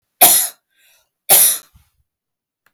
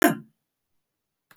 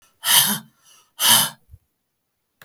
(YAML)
three_cough_length: 2.7 s
three_cough_amplitude: 32768
three_cough_signal_mean_std_ratio: 0.36
cough_length: 1.4 s
cough_amplitude: 18813
cough_signal_mean_std_ratio: 0.23
exhalation_length: 2.6 s
exhalation_amplitude: 32768
exhalation_signal_mean_std_ratio: 0.38
survey_phase: beta (2021-08-13 to 2022-03-07)
age: 45-64
gender: Female
wearing_mask: 'No'
symptom_none: true
smoker_status: Never smoked
respiratory_condition_asthma: false
respiratory_condition_other: false
recruitment_source: REACT
submission_delay: 3 days
covid_test_result: Negative
covid_test_method: RT-qPCR
influenza_a_test_result: Negative
influenza_b_test_result: Negative